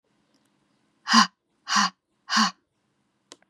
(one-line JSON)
{"exhalation_length": "3.5 s", "exhalation_amplitude": 25340, "exhalation_signal_mean_std_ratio": 0.31, "survey_phase": "beta (2021-08-13 to 2022-03-07)", "age": "18-44", "gender": "Female", "wearing_mask": "No", "symptom_runny_or_blocked_nose": true, "symptom_sore_throat": true, "symptom_fatigue": true, "symptom_fever_high_temperature": true, "symptom_onset": "3 days", "smoker_status": "Never smoked", "respiratory_condition_asthma": false, "respiratory_condition_other": false, "recruitment_source": "Test and Trace", "submission_delay": "-2 days", "covid_test_result": "Positive", "covid_test_method": "RT-qPCR", "covid_ct_value": 18.2, "covid_ct_gene": "N gene", "covid_ct_mean": 19.0, "covid_viral_load": "570000 copies/ml", "covid_viral_load_category": "Low viral load (10K-1M copies/ml)"}